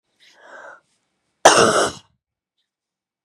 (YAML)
cough_length: 3.2 s
cough_amplitude: 32768
cough_signal_mean_std_ratio: 0.28
survey_phase: beta (2021-08-13 to 2022-03-07)
age: 18-44
gender: Female
wearing_mask: 'No'
symptom_cough_any: true
symptom_shortness_of_breath: true
symptom_sore_throat: true
symptom_fatigue: true
symptom_change_to_sense_of_smell_or_taste: true
symptom_other: true
symptom_onset: 3 days
smoker_status: Never smoked
respiratory_condition_asthma: false
respiratory_condition_other: false
recruitment_source: Test and Trace
submission_delay: 1 day
covid_test_result: Positive
covid_test_method: RT-qPCR
covid_ct_value: 20.8
covid_ct_gene: ORF1ab gene
covid_ct_mean: 21.0
covid_viral_load: 130000 copies/ml
covid_viral_load_category: Low viral load (10K-1M copies/ml)